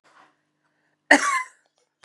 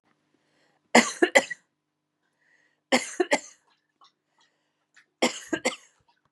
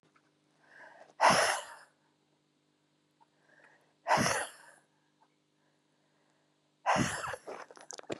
{"cough_length": "2.0 s", "cough_amplitude": 32018, "cough_signal_mean_std_ratio": 0.26, "three_cough_length": "6.3 s", "three_cough_amplitude": 26749, "three_cough_signal_mean_std_ratio": 0.25, "exhalation_length": "8.2 s", "exhalation_amplitude": 8667, "exhalation_signal_mean_std_ratio": 0.32, "survey_phase": "beta (2021-08-13 to 2022-03-07)", "age": "45-64", "gender": "Female", "wearing_mask": "No", "symptom_none": true, "smoker_status": "Never smoked", "respiratory_condition_asthma": true, "respiratory_condition_other": false, "recruitment_source": "REACT", "submission_delay": "3 days", "covid_test_result": "Negative", "covid_test_method": "RT-qPCR", "influenza_a_test_result": "Negative", "influenza_b_test_result": "Negative"}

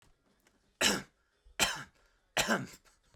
{"three_cough_length": "3.2 s", "three_cough_amplitude": 7255, "three_cough_signal_mean_std_ratio": 0.36, "survey_phase": "beta (2021-08-13 to 2022-03-07)", "age": "18-44", "gender": "Male", "wearing_mask": "No", "symptom_none": true, "smoker_status": "Never smoked", "respiratory_condition_asthma": false, "respiratory_condition_other": false, "recruitment_source": "REACT", "submission_delay": "3 days", "covid_test_result": "Negative", "covid_test_method": "RT-qPCR"}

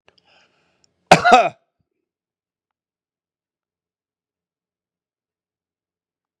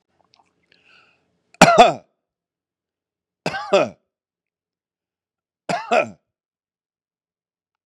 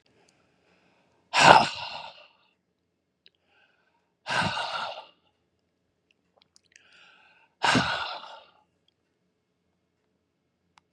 {"cough_length": "6.4 s", "cough_amplitude": 32768, "cough_signal_mean_std_ratio": 0.17, "three_cough_length": "7.9 s", "three_cough_amplitude": 32768, "three_cough_signal_mean_std_ratio": 0.23, "exhalation_length": "10.9 s", "exhalation_amplitude": 32768, "exhalation_signal_mean_std_ratio": 0.24, "survey_phase": "beta (2021-08-13 to 2022-03-07)", "age": "45-64", "gender": "Male", "wearing_mask": "No", "symptom_none": true, "smoker_status": "Ex-smoker", "respiratory_condition_asthma": false, "respiratory_condition_other": false, "recruitment_source": "REACT", "submission_delay": "3 days", "covid_test_result": "Negative", "covid_test_method": "RT-qPCR", "influenza_a_test_result": "Negative", "influenza_b_test_result": "Negative"}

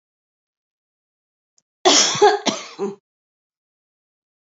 {"cough_length": "4.4 s", "cough_amplitude": 31106, "cough_signal_mean_std_ratio": 0.3, "survey_phase": "beta (2021-08-13 to 2022-03-07)", "age": "45-64", "gender": "Female", "wearing_mask": "No", "symptom_none": true, "smoker_status": "Never smoked", "respiratory_condition_asthma": false, "respiratory_condition_other": false, "recruitment_source": "REACT", "submission_delay": "2 days", "covid_test_result": "Negative", "covid_test_method": "RT-qPCR", "influenza_a_test_result": "Negative", "influenza_b_test_result": "Negative"}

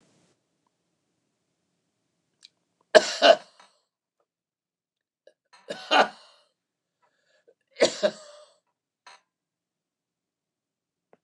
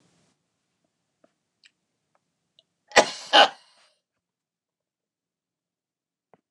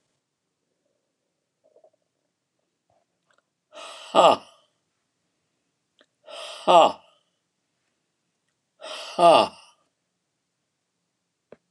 {"three_cough_length": "11.2 s", "three_cough_amplitude": 29133, "three_cough_signal_mean_std_ratio": 0.18, "cough_length": "6.5 s", "cough_amplitude": 29203, "cough_signal_mean_std_ratio": 0.15, "exhalation_length": "11.7 s", "exhalation_amplitude": 25883, "exhalation_signal_mean_std_ratio": 0.21, "survey_phase": "beta (2021-08-13 to 2022-03-07)", "age": "65+", "gender": "Male", "wearing_mask": "No", "symptom_cough_any": true, "symptom_shortness_of_breath": true, "symptom_fatigue": true, "smoker_status": "Never smoked", "respiratory_condition_asthma": false, "respiratory_condition_other": false, "recruitment_source": "REACT", "submission_delay": "3 days", "covid_test_result": "Negative", "covid_test_method": "RT-qPCR", "influenza_a_test_result": "Negative", "influenza_b_test_result": "Negative"}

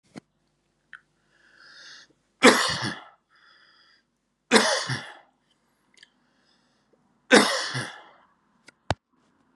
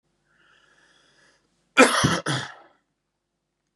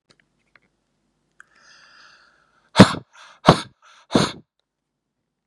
{"three_cough_length": "9.6 s", "three_cough_amplitude": 31225, "three_cough_signal_mean_std_ratio": 0.27, "cough_length": "3.8 s", "cough_amplitude": 31939, "cough_signal_mean_std_ratio": 0.27, "exhalation_length": "5.5 s", "exhalation_amplitude": 32768, "exhalation_signal_mean_std_ratio": 0.19, "survey_phase": "beta (2021-08-13 to 2022-03-07)", "age": "18-44", "gender": "Male", "wearing_mask": "No", "symptom_runny_or_blocked_nose": true, "symptom_headache": true, "symptom_onset": "3 days", "smoker_status": "Never smoked", "respiratory_condition_asthma": false, "respiratory_condition_other": false, "recruitment_source": "Test and Trace", "submission_delay": "2 days", "covid_test_result": "Positive", "covid_test_method": "RT-qPCR", "covid_ct_value": 26.7, "covid_ct_gene": "N gene"}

